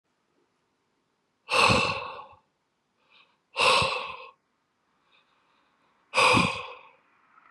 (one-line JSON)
{"exhalation_length": "7.5 s", "exhalation_amplitude": 13731, "exhalation_signal_mean_std_ratio": 0.36, "survey_phase": "beta (2021-08-13 to 2022-03-07)", "age": "18-44", "gender": "Male", "wearing_mask": "No", "symptom_cough_any": true, "symptom_new_continuous_cough": true, "symptom_runny_or_blocked_nose": true, "symptom_sore_throat": true, "symptom_abdominal_pain": true, "symptom_diarrhoea": true, "symptom_fatigue": true, "symptom_headache": true, "symptom_onset": "6 days", "smoker_status": "Ex-smoker", "respiratory_condition_asthma": false, "respiratory_condition_other": false, "recruitment_source": "Test and Trace", "submission_delay": "1 day", "covid_test_result": "Positive", "covid_test_method": "RT-qPCR", "covid_ct_value": 20.2, "covid_ct_gene": "ORF1ab gene", "covid_ct_mean": 20.8, "covid_viral_load": "160000 copies/ml", "covid_viral_load_category": "Low viral load (10K-1M copies/ml)"}